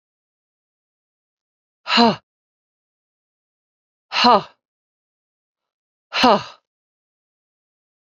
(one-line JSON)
{"exhalation_length": "8.0 s", "exhalation_amplitude": 28550, "exhalation_signal_mean_std_ratio": 0.23, "survey_phase": "beta (2021-08-13 to 2022-03-07)", "age": "45-64", "gender": "Female", "wearing_mask": "No", "symptom_runny_or_blocked_nose": true, "symptom_headache": true, "symptom_change_to_sense_of_smell_or_taste": true, "symptom_onset": "4 days", "smoker_status": "Never smoked", "respiratory_condition_asthma": false, "respiratory_condition_other": false, "recruitment_source": "Test and Trace", "submission_delay": "2 days", "covid_test_result": "Positive", "covid_test_method": "ePCR"}